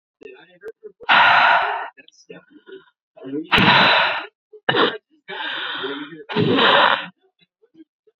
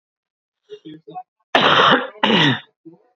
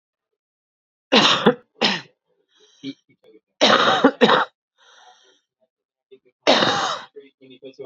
{"exhalation_length": "8.2 s", "exhalation_amplitude": 27130, "exhalation_signal_mean_std_ratio": 0.51, "cough_length": "3.2 s", "cough_amplitude": 32767, "cough_signal_mean_std_ratio": 0.46, "three_cough_length": "7.9 s", "three_cough_amplitude": 28663, "three_cough_signal_mean_std_ratio": 0.38, "survey_phase": "beta (2021-08-13 to 2022-03-07)", "age": "18-44", "gender": "Female", "wearing_mask": "No", "symptom_abdominal_pain": true, "symptom_diarrhoea": true, "symptom_fatigue": true, "symptom_onset": "13 days", "smoker_status": "Current smoker (1 to 10 cigarettes per day)", "respiratory_condition_asthma": false, "respiratory_condition_other": false, "recruitment_source": "REACT", "submission_delay": "2 days", "covid_test_result": "Negative", "covid_test_method": "RT-qPCR", "influenza_a_test_result": "Negative", "influenza_b_test_result": "Negative"}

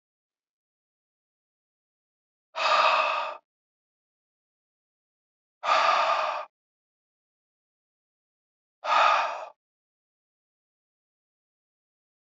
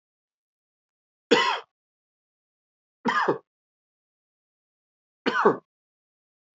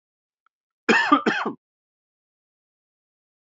{"exhalation_length": "12.2 s", "exhalation_amplitude": 13610, "exhalation_signal_mean_std_ratio": 0.32, "three_cough_length": "6.6 s", "three_cough_amplitude": 18767, "three_cough_signal_mean_std_ratio": 0.27, "cough_length": "3.5 s", "cough_amplitude": 25063, "cough_signal_mean_std_ratio": 0.29, "survey_phase": "beta (2021-08-13 to 2022-03-07)", "age": "18-44", "gender": "Male", "wearing_mask": "No", "symptom_cough_any": true, "symptom_runny_or_blocked_nose": true, "symptom_fatigue": true, "symptom_headache": true, "symptom_change_to_sense_of_smell_or_taste": true, "symptom_onset": "5 days", "smoker_status": "Never smoked", "respiratory_condition_asthma": false, "respiratory_condition_other": false, "recruitment_source": "Test and Trace", "submission_delay": "1 day", "covid_test_result": "Positive", "covid_test_method": "RT-qPCR", "covid_ct_value": 18.3, "covid_ct_gene": "ORF1ab gene", "covid_ct_mean": 19.5, "covid_viral_load": "390000 copies/ml", "covid_viral_load_category": "Low viral load (10K-1M copies/ml)"}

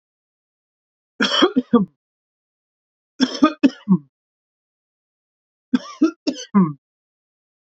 {"three_cough_length": "7.8 s", "three_cough_amplitude": 27456, "three_cough_signal_mean_std_ratio": 0.31, "survey_phase": "beta (2021-08-13 to 2022-03-07)", "age": "18-44", "gender": "Male", "wearing_mask": "No", "symptom_cough_any": true, "symptom_runny_or_blocked_nose": true, "symptom_diarrhoea": true, "symptom_fatigue": true, "symptom_headache": true, "symptom_onset": "5 days", "smoker_status": "Ex-smoker", "respiratory_condition_asthma": false, "respiratory_condition_other": false, "recruitment_source": "Test and Trace", "submission_delay": "2 days", "covid_test_result": "Positive", "covid_test_method": "RT-qPCR", "covid_ct_value": 12.2, "covid_ct_gene": "N gene", "covid_ct_mean": 12.5, "covid_viral_load": "79000000 copies/ml", "covid_viral_load_category": "High viral load (>1M copies/ml)"}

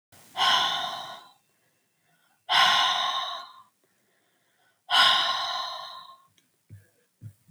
{"exhalation_length": "7.5 s", "exhalation_amplitude": 15094, "exhalation_signal_mean_std_ratio": 0.46, "survey_phase": "alpha (2021-03-01 to 2021-08-12)", "age": "18-44", "gender": "Female", "wearing_mask": "No", "symptom_none": true, "symptom_onset": "11 days", "smoker_status": "Never smoked", "respiratory_condition_asthma": false, "respiratory_condition_other": false, "recruitment_source": "REACT", "submission_delay": "2 days", "covid_test_result": "Negative", "covid_test_method": "RT-qPCR"}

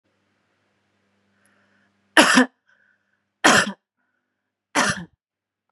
{"three_cough_length": "5.7 s", "three_cough_amplitude": 32767, "three_cough_signal_mean_std_ratio": 0.27, "survey_phase": "beta (2021-08-13 to 2022-03-07)", "age": "18-44", "gender": "Female", "wearing_mask": "No", "symptom_none": true, "smoker_status": "Never smoked", "respiratory_condition_asthma": false, "respiratory_condition_other": false, "recruitment_source": "REACT", "submission_delay": "2 days", "covid_test_result": "Negative", "covid_test_method": "RT-qPCR", "influenza_a_test_result": "Negative", "influenza_b_test_result": "Negative"}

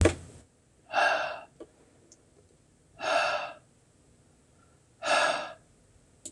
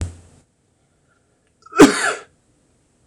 {"exhalation_length": "6.3 s", "exhalation_amplitude": 15288, "exhalation_signal_mean_std_ratio": 0.4, "cough_length": "3.1 s", "cough_amplitude": 26028, "cough_signal_mean_std_ratio": 0.25, "survey_phase": "beta (2021-08-13 to 2022-03-07)", "age": "45-64", "gender": "Male", "wearing_mask": "No", "symptom_none": true, "smoker_status": "Never smoked", "respiratory_condition_asthma": false, "respiratory_condition_other": false, "recruitment_source": "Test and Trace", "submission_delay": "1 day", "covid_test_result": "Negative", "covid_test_method": "RT-qPCR"}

